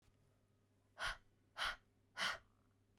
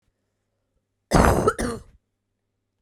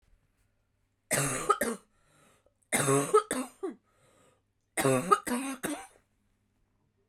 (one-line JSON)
{"exhalation_length": "3.0 s", "exhalation_amplitude": 1324, "exhalation_signal_mean_std_ratio": 0.37, "cough_length": "2.8 s", "cough_amplitude": 32768, "cough_signal_mean_std_ratio": 0.34, "three_cough_length": "7.1 s", "three_cough_amplitude": 11992, "three_cough_signal_mean_std_ratio": 0.4, "survey_phase": "beta (2021-08-13 to 2022-03-07)", "age": "18-44", "gender": "Female", "wearing_mask": "No", "symptom_cough_any": true, "symptom_runny_or_blocked_nose": true, "symptom_fatigue": true, "symptom_fever_high_temperature": true, "symptom_headache": true, "symptom_other": true, "smoker_status": "Ex-smoker", "respiratory_condition_asthma": false, "respiratory_condition_other": false, "recruitment_source": "Test and Trace", "submission_delay": "1 day", "covid_test_result": "Positive", "covid_test_method": "RT-qPCR", "covid_ct_value": 21.2, "covid_ct_gene": "ORF1ab gene"}